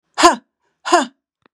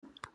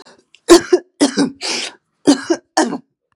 {"exhalation_length": "1.5 s", "exhalation_amplitude": 32768, "exhalation_signal_mean_std_ratio": 0.35, "cough_length": "0.3 s", "cough_amplitude": 2147, "cough_signal_mean_std_ratio": 0.46, "three_cough_length": "3.2 s", "three_cough_amplitude": 32768, "three_cough_signal_mean_std_ratio": 0.41, "survey_phase": "beta (2021-08-13 to 2022-03-07)", "age": "65+", "gender": "Female", "wearing_mask": "No", "symptom_cough_any": true, "symptom_runny_or_blocked_nose": true, "symptom_fatigue": true, "symptom_headache": true, "smoker_status": "Never smoked", "respiratory_condition_asthma": false, "respiratory_condition_other": false, "recruitment_source": "Test and Trace", "submission_delay": "1 day", "covid_test_result": "Positive", "covid_test_method": "RT-qPCR", "covid_ct_value": 16.1, "covid_ct_gene": "N gene", "covid_ct_mean": 17.1, "covid_viral_load": "2400000 copies/ml", "covid_viral_load_category": "High viral load (>1M copies/ml)"}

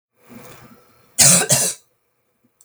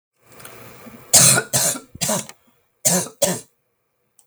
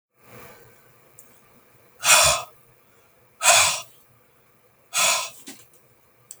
{"cough_length": "2.6 s", "cough_amplitude": 32768, "cough_signal_mean_std_ratio": 0.35, "three_cough_length": "4.3 s", "three_cough_amplitude": 32768, "three_cough_signal_mean_std_ratio": 0.4, "exhalation_length": "6.4 s", "exhalation_amplitude": 31792, "exhalation_signal_mean_std_ratio": 0.34, "survey_phase": "beta (2021-08-13 to 2022-03-07)", "age": "65+", "gender": "Female", "wearing_mask": "No", "symptom_none": true, "smoker_status": "Never smoked", "respiratory_condition_asthma": false, "respiratory_condition_other": false, "recruitment_source": "REACT", "submission_delay": "2 days", "covid_test_result": "Negative", "covid_test_method": "RT-qPCR", "influenza_a_test_result": "Negative", "influenza_b_test_result": "Negative"}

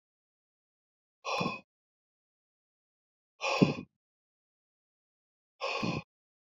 {"exhalation_length": "6.5 s", "exhalation_amplitude": 11363, "exhalation_signal_mean_std_ratio": 0.27, "survey_phase": "beta (2021-08-13 to 2022-03-07)", "age": "45-64", "gender": "Male", "wearing_mask": "No", "symptom_runny_or_blocked_nose": true, "symptom_fatigue": true, "symptom_headache": true, "symptom_change_to_sense_of_smell_or_taste": true, "symptom_onset": "3 days", "smoker_status": "Never smoked", "respiratory_condition_asthma": true, "respiratory_condition_other": false, "recruitment_source": "Test and Trace", "submission_delay": "2 days", "covid_test_result": "Positive", "covid_test_method": "ePCR"}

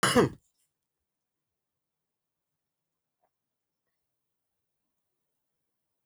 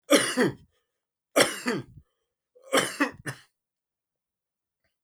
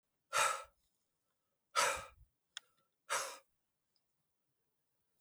{"cough_length": "6.1 s", "cough_amplitude": 10811, "cough_signal_mean_std_ratio": 0.16, "three_cough_length": "5.0 s", "three_cough_amplitude": 17492, "three_cough_signal_mean_std_ratio": 0.34, "exhalation_length": "5.2 s", "exhalation_amplitude": 3573, "exhalation_signal_mean_std_ratio": 0.3, "survey_phase": "beta (2021-08-13 to 2022-03-07)", "age": "45-64", "gender": "Male", "wearing_mask": "No", "symptom_cough_any": true, "symptom_runny_or_blocked_nose": true, "symptom_sore_throat": true, "symptom_fatigue": true, "symptom_fever_high_temperature": true, "smoker_status": "Never smoked", "respiratory_condition_asthma": false, "respiratory_condition_other": false, "recruitment_source": "Test and Trace", "submission_delay": "1 day", "covid_test_result": "Positive", "covid_test_method": "RT-qPCR", "covid_ct_value": 18.2, "covid_ct_gene": "ORF1ab gene", "covid_ct_mean": 18.5, "covid_viral_load": "890000 copies/ml", "covid_viral_load_category": "Low viral load (10K-1M copies/ml)"}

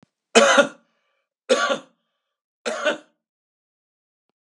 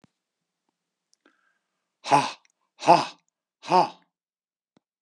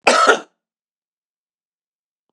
{"three_cough_length": "4.5 s", "three_cough_amplitude": 32489, "three_cough_signal_mean_std_ratio": 0.31, "exhalation_length": "5.0 s", "exhalation_amplitude": 27095, "exhalation_signal_mean_std_ratio": 0.24, "cough_length": "2.3 s", "cough_amplitude": 32767, "cough_signal_mean_std_ratio": 0.29, "survey_phase": "beta (2021-08-13 to 2022-03-07)", "age": "65+", "gender": "Male", "wearing_mask": "No", "symptom_none": true, "smoker_status": "Ex-smoker", "respiratory_condition_asthma": false, "respiratory_condition_other": false, "recruitment_source": "REACT", "submission_delay": "1 day", "covid_test_result": "Negative", "covid_test_method": "RT-qPCR", "influenza_a_test_result": "Negative", "influenza_b_test_result": "Negative"}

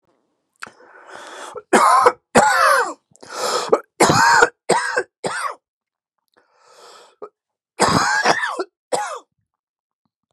{"three_cough_length": "10.3 s", "three_cough_amplitude": 32767, "three_cough_signal_mean_std_ratio": 0.46, "survey_phase": "beta (2021-08-13 to 2022-03-07)", "age": "45-64", "gender": "Male", "wearing_mask": "No", "symptom_none": true, "smoker_status": "Ex-smoker", "respiratory_condition_asthma": false, "respiratory_condition_other": false, "recruitment_source": "REACT", "submission_delay": "1 day", "covid_test_result": "Negative", "covid_test_method": "RT-qPCR", "influenza_a_test_result": "Negative", "influenza_b_test_result": "Negative"}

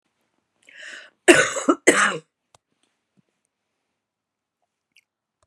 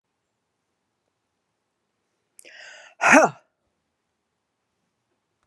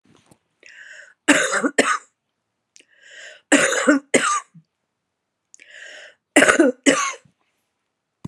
{"cough_length": "5.5 s", "cough_amplitude": 32767, "cough_signal_mean_std_ratio": 0.25, "exhalation_length": "5.5 s", "exhalation_amplitude": 32269, "exhalation_signal_mean_std_ratio": 0.18, "three_cough_length": "8.3 s", "three_cough_amplitude": 32767, "three_cough_signal_mean_std_ratio": 0.38, "survey_phase": "beta (2021-08-13 to 2022-03-07)", "age": "65+", "gender": "Female", "wearing_mask": "No", "symptom_cough_any": true, "symptom_change_to_sense_of_smell_or_taste": true, "symptom_loss_of_taste": true, "symptom_onset": "5 days", "smoker_status": "Never smoked", "respiratory_condition_asthma": true, "respiratory_condition_other": false, "recruitment_source": "Test and Trace", "submission_delay": "1 day", "covid_test_result": "Positive", "covid_test_method": "RT-qPCR"}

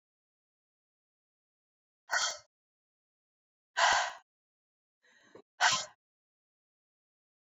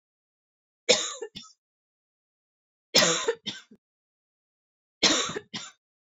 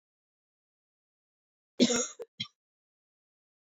{"exhalation_length": "7.4 s", "exhalation_amplitude": 9317, "exhalation_signal_mean_std_ratio": 0.25, "three_cough_length": "6.1 s", "three_cough_amplitude": 18658, "three_cough_signal_mean_std_ratio": 0.31, "cough_length": "3.7 s", "cough_amplitude": 10544, "cough_signal_mean_std_ratio": 0.21, "survey_phase": "beta (2021-08-13 to 2022-03-07)", "age": "18-44", "gender": "Female", "wearing_mask": "No", "symptom_cough_any": true, "symptom_runny_or_blocked_nose": true, "symptom_sore_throat": true, "symptom_fatigue": true, "symptom_headache": true, "symptom_other": true, "smoker_status": "Never smoked", "respiratory_condition_asthma": false, "respiratory_condition_other": false, "recruitment_source": "Test and Trace", "submission_delay": "1 day", "covid_test_result": "Positive", "covid_test_method": "RT-qPCR", "covid_ct_value": 22.7, "covid_ct_gene": "ORF1ab gene"}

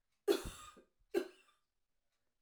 {"cough_length": "2.4 s", "cough_amplitude": 3470, "cough_signal_mean_std_ratio": 0.27, "survey_phase": "alpha (2021-03-01 to 2021-08-12)", "age": "45-64", "gender": "Female", "wearing_mask": "No", "symptom_none": true, "smoker_status": "Ex-smoker", "respiratory_condition_asthma": true, "respiratory_condition_other": false, "recruitment_source": "REACT", "submission_delay": "1 day", "covid_test_result": "Negative", "covid_test_method": "RT-qPCR"}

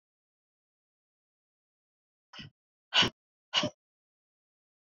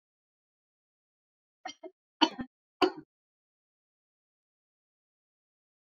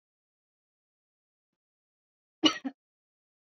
{"exhalation_length": "4.9 s", "exhalation_amplitude": 8557, "exhalation_signal_mean_std_ratio": 0.19, "three_cough_length": "5.9 s", "three_cough_amplitude": 15437, "three_cough_signal_mean_std_ratio": 0.14, "cough_length": "3.5 s", "cough_amplitude": 12645, "cough_signal_mean_std_ratio": 0.14, "survey_phase": "beta (2021-08-13 to 2022-03-07)", "age": "45-64", "gender": "Female", "wearing_mask": "No", "symptom_none": true, "smoker_status": "Never smoked", "respiratory_condition_asthma": false, "respiratory_condition_other": false, "recruitment_source": "REACT", "submission_delay": "1 day", "covid_test_result": "Negative", "covid_test_method": "RT-qPCR", "influenza_a_test_result": "Negative", "influenza_b_test_result": "Negative"}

